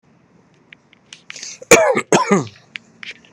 {"cough_length": "3.3 s", "cough_amplitude": 32768, "cough_signal_mean_std_ratio": 0.34, "survey_phase": "beta (2021-08-13 to 2022-03-07)", "age": "18-44", "gender": "Male", "wearing_mask": "No", "symptom_shortness_of_breath": true, "smoker_status": "Ex-smoker", "respiratory_condition_asthma": false, "respiratory_condition_other": false, "recruitment_source": "REACT", "submission_delay": "4 days", "covid_test_result": "Negative", "covid_test_method": "RT-qPCR"}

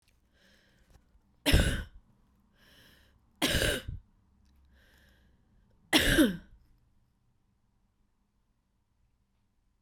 {"three_cough_length": "9.8 s", "three_cough_amplitude": 13208, "three_cough_signal_mean_std_ratio": 0.28, "survey_phase": "beta (2021-08-13 to 2022-03-07)", "age": "18-44", "gender": "Female", "wearing_mask": "No", "symptom_cough_any": true, "symptom_runny_or_blocked_nose": true, "symptom_shortness_of_breath": true, "symptom_sore_throat": true, "symptom_diarrhoea": true, "symptom_fatigue": true, "symptom_fever_high_temperature": true, "symptom_headache": true, "smoker_status": "Never smoked", "respiratory_condition_asthma": false, "respiratory_condition_other": true, "recruitment_source": "Test and Trace", "submission_delay": "2 days", "covid_test_result": "Positive", "covid_test_method": "RT-qPCR", "covid_ct_value": 25.6, "covid_ct_gene": "N gene"}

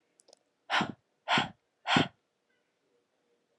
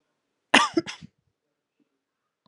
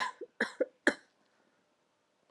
{"exhalation_length": "3.6 s", "exhalation_amplitude": 10478, "exhalation_signal_mean_std_ratio": 0.31, "cough_length": "2.5 s", "cough_amplitude": 31765, "cough_signal_mean_std_ratio": 0.21, "three_cough_length": "2.3 s", "three_cough_amplitude": 9325, "three_cough_signal_mean_std_ratio": 0.26, "survey_phase": "alpha (2021-03-01 to 2021-08-12)", "age": "18-44", "gender": "Female", "wearing_mask": "No", "symptom_cough_any": true, "symptom_shortness_of_breath": true, "symptom_fatigue": true, "symptom_change_to_sense_of_smell_or_taste": true, "symptom_onset": "10 days", "smoker_status": "Never smoked", "respiratory_condition_asthma": false, "respiratory_condition_other": false, "recruitment_source": "Test and Trace", "submission_delay": "2 days", "covid_test_result": "Positive", "covid_test_method": "RT-qPCR", "covid_ct_value": 18.4, "covid_ct_gene": "N gene", "covid_ct_mean": 18.6, "covid_viral_load": "800000 copies/ml", "covid_viral_load_category": "Low viral load (10K-1M copies/ml)"}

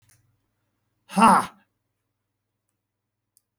{"exhalation_length": "3.6 s", "exhalation_amplitude": 23756, "exhalation_signal_mean_std_ratio": 0.22, "survey_phase": "beta (2021-08-13 to 2022-03-07)", "age": "65+", "gender": "Male", "wearing_mask": "No", "symptom_none": true, "smoker_status": "Never smoked", "respiratory_condition_asthma": false, "respiratory_condition_other": false, "recruitment_source": "REACT", "submission_delay": "1 day", "covid_test_result": "Negative", "covid_test_method": "RT-qPCR", "influenza_a_test_result": "Negative", "influenza_b_test_result": "Negative"}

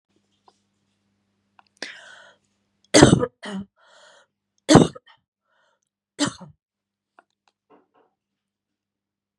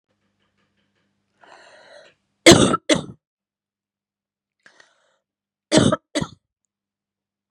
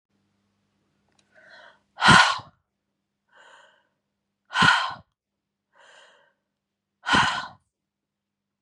{"three_cough_length": "9.4 s", "three_cough_amplitude": 32768, "three_cough_signal_mean_std_ratio": 0.19, "cough_length": "7.5 s", "cough_amplitude": 32768, "cough_signal_mean_std_ratio": 0.22, "exhalation_length": "8.6 s", "exhalation_amplitude": 26247, "exhalation_signal_mean_std_ratio": 0.26, "survey_phase": "beta (2021-08-13 to 2022-03-07)", "age": "45-64", "gender": "Female", "wearing_mask": "No", "symptom_cough_any": true, "symptom_runny_or_blocked_nose": true, "symptom_fever_high_temperature": true, "symptom_onset": "3 days", "smoker_status": "Ex-smoker", "respiratory_condition_asthma": false, "respiratory_condition_other": false, "recruitment_source": "Test and Trace", "submission_delay": "2 days", "covid_test_result": "Positive", "covid_test_method": "RT-qPCR", "covid_ct_value": 32.1, "covid_ct_gene": "ORF1ab gene"}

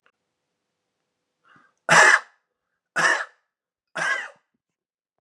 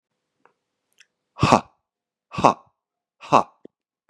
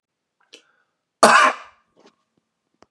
{"three_cough_length": "5.2 s", "three_cough_amplitude": 27234, "three_cough_signal_mean_std_ratio": 0.29, "exhalation_length": "4.1 s", "exhalation_amplitude": 32767, "exhalation_signal_mean_std_ratio": 0.21, "cough_length": "2.9 s", "cough_amplitude": 32768, "cough_signal_mean_std_ratio": 0.26, "survey_phase": "beta (2021-08-13 to 2022-03-07)", "age": "18-44", "gender": "Male", "wearing_mask": "No", "symptom_runny_or_blocked_nose": true, "smoker_status": "Ex-smoker", "respiratory_condition_asthma": false, "respiratory_condition_other": false, "recruitment_source": "Test and Trace", "submission_delay": "2 days", "covid_test_result": "Positive", "covid_test_method": "RT-qPCR", "covid_ct_value": 20.5, "covid_ct_gene": "ORF1ab gene", "covid_ct_mean": 21.2, "covid_viral_load": "110000 copies/ml", "covid_viral_load_category": "Low viral load (10K-1M copies/ml)"}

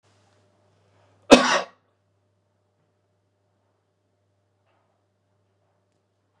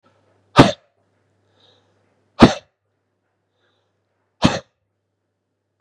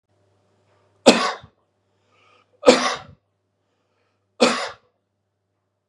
{"cough_length": "6.4 s", "cough_amplitude": 32768, "cough_signal_mean_std_ratio": 0.14, "exhalation_length": "5.8 s", "exhalation_amplitude": 32768, "exhalation_signal_mean_std_ratio": 0.18, "three_cough_length": "5.9 s", "three_cough_amplitude": 32768, "three_cough_signal_mean_std_ratio": 0.25, "survey_phase": "beta (2021-08-13 to 2022-03-07)", "age": "45-64", "gender": "Male", "wearing_mask": "No", "symptom_none": true, "smoker_status": "Never smoked", "respiratory_condition_asthma": true, "respiratory_condition_other": false, "recruitment_source": "Test and Trace", "submission_delay": "3 days", "covid_test_result": "Negative", "covid_test_method": "RT-qPCR"}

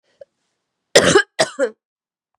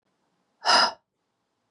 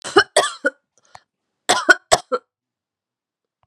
{"cough_length": "2.4 s", "cough_amplitude": 32768, "cough_signal_mean_std_ratio": 0.32, "exhalation_length": "1.7 s", "exhalation_amplitude": 15997, "exhalation_signal_mean_std_ratio": 0.31, "three_cough_length": "3.7 s", "three_cough_amplitude": 32768, "three_cough_signal_mean_std_ratio": 0.28, "survey_phase": "beta (2021-08-13 to 2022-03-07)", "age": "45-64", "gender": "Female", "wearing_mask": "No", "symptom_cough_any": true, "symptom_runny_or_blocked_nose": true, "symptom_shortness_of_breath": true, "symptom_sore_throat": true, "symptom_abdominal_pain": true, "symptom_diarrhoea": true, "symptom_fatigue": true, "symptom_fever_high_temperature": true, "symptom_headache": true, "symptom_onset": "5 days", "smoker_status": "Never smoked", "respiratory_condition_asthma": false, "respiratory_condition_other": false, "recruitment_source": "Test and Trace", "submission_delay": "1 day", "covid_test_result": "Positive", "covid_test_method": "RT-qPCR", "covid_ct_value": 18.6, "covid_ct_gene": "ORF1ab gene"}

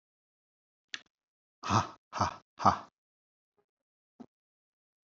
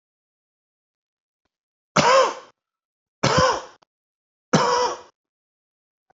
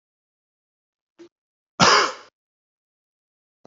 {"exhalation_length": "5.1 s", "exhalation_amplitude": 10452, "exhalation_signal_mean_std_ratio": 0.23, "three_cough_length": "6.1 s", "three_cough_amplitude": 29331, "three_cough_signal_mean_std_ratio": 0.34, "cough_length": "3.7 s", "cough_amplitude": 27098, "cough_signal_mean_std_ratio": 0.23, "survey_phase": "beta (2021-08-13 to 2022-03-07)", "age": "45-64", "gender": "Male", "wearing_mask": "No", "symptom_none": true, "smoker_status": "Never smoked", "respiratory_condition_asthma": false, "respiratory_condition_other": false, "recruitment_source": "REACT", "submission_delay": "1 day", "covid_test_result": "Negative", "covid_test_method": "RT-qPCR"}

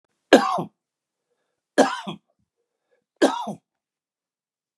{"three_cough_length": "4.8 s", "three_cough_amplitude": 32583, "three_cough_signal_mean_std_ratio": 0.26, "survey_phase": "beta (2021-08-13 to 2022-03-07)", "age": "65+", "gender": "Male", "wearing_mask": "No", "symptom_none": true, "smoker_status": "Ex-smoker", "respiratory_condition_asthma": false, "respiratory_condition_other": false, "recruitment_source": "REACT", "submission_delay": "1 day", "covid_test_result": "Negative", "covid_test_method": "RT-qPCR", "influenza_a_test_result": "Negative", "influenza_b_test_result": "Negative"}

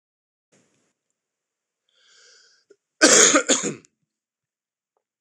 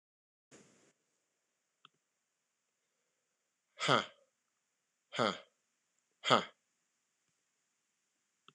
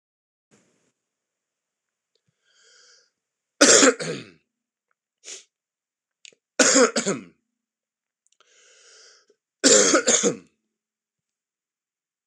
{"cough_length": "5.2 s", "cough_amplitude": 26028, "cough_signal_mean_std_ratio": 0.26, "exhalation_length": "8.5 s", "exhalation_amplitude": 8932, "exhalation_signal_mean_std_ratio": 0.18, "three_cough_length": "12.3 s", "three_cough_amplitude": 26028, "three_cough_signal_mean_std_ratio": 0.28, "survey_phase": "beta (2021-08-13 to 2022-03-07)", "age": "45-64", "gender": "Male", "wearing_mask": "No", "symptom_cough_any": true, "symptom_fatigue": true, "symptom_onset": "3 days", "smoker_status": "Never smoked", "respiratory_condition_asthma": false, "respiratory_condition_other": false, "recruitment_source": "Test and Trace", "submission_delay": "1 day", "covid_test_result": "Positive", "covid_test_method": "RT-qPCR", "covid_ct_value": 17.5, "covid_ct_gene": "ORF1ab gene", "covid_ct_mean": 17.9, "covid_viral_load": "1300000 copies/ml", "covid_viral_load_category": "High viral load (>1M copies/ml)"}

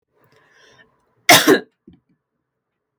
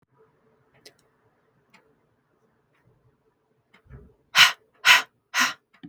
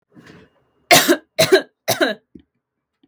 {"cough_length": "3.0 s", "cough_amplitude": 32768, "cough_signal_mean_std_ratio": 0.24, "exhalation_length": "5.9 s", "exhalation_amplitude": 32766, "exhalation_signal_mean_std_ratio": 0.22, "three_cough_length": "3.1 s", "three_cough_amplitude": 32768, "three_cough_signal_mean_std_ratio": 0.35, "survey_phase": "beta (2021-08-13 to 2022-03-07)", "age": "18-44", "gender": "Female", "wearing_mask": "No", "symptom_none": true, "smoker_status": "Never smoked", "respiratory_condition_asthma": false, "respiratory_condition_other": false, "recruitment_source": "REACT", "submission_delay": "2 days", "covid_test_result": "Negative", "covid_test_method": "RT-qPCR"}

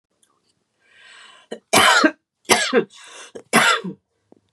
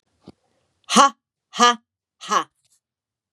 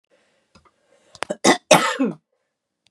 {"three_cough_length": "4.5 s", "three_cough_amplitude": 32767, "three_cough_signal_mean_std_ratio": 0.39, "exhalation_length": "3.3 s", "exhalation_amplitude": 31798, "exhalation_signal_mean_std_ratio": 0.29, "cough_length": "2.9 s", "cough_amplitude": 32768, "cough_signal_mean_std_ratio": 0.3, "survey_phase": "beta (2021-08-13 to 2022-03-07)", "age": "45-64", "gender": "Female", "wearing_mask": "No", "symptom_none": true, "smoker_status": "Never smoked", "respiratory_condition_asthma": false, "respiratory_condition_other": false, "recruitment_source": "REACT", "submission_delay": "1 day", "covid_test_result": "Negative", "covid_test_method": "RT-qPCR", "influenza_a_test_result": "Negative", "influenza_b_test_result": "Negative"}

